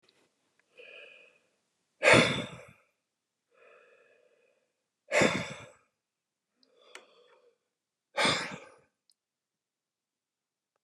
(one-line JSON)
{"exhalation_length": "10.8 s", "exhalation_amplitude": 16211, "exhalation_signal_mean_std_ratio": 0.24, "survey_phase": "beta (2021-08-13 to 2022-03-07)", "age": "45-64", "gender": "Male", "wearing_mask": "No", "symptom_none": true, "smoker_status": "Never smoked", "respiratory_condition_asthma": false, "respiratory_condition_other": false, "recruitment_source": "REACT", "submission_delay": "2 days", "covid_test_result": "Negative", "covid_test_method": "RT-qPCR", "influenza_a_test_result": "Negative", "influenza_b_test_result": "Negative"}